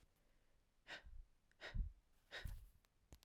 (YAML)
exhalation_length: 3.2 s
exhalation_amplitude: 708
exhalation_signal_mean_std_ratio: 0.43
survey_phase: alpha (2021-03-01 to 2021-08-12)
age: 18-44
gender: Female
wearing_mask: 'No'
symptom_cough_any: true
symptom_fatigue: true
symptom_fever_high_temperature: true
symptom_headache: true
symptom_change_to_sense_of_smell_or_taste: true
symptom_onset: 4 days
smoker_status: Ex-smoker
respiratory_condition_asthma: false
respiratory_condition_other: false
recruitment_source: Test and Trace
submission_delay: 2 days
covid_test_result: Positive
covid_test_method: RT-qPCR
covid_ct_value: 15.4
covid_ct_gene: ORF1ab gene
covid_ct_mean: 15.9
covid_viral_load: 6300000 copies/ml
covid_viral_load_category: High viral load (>1M copies/ml)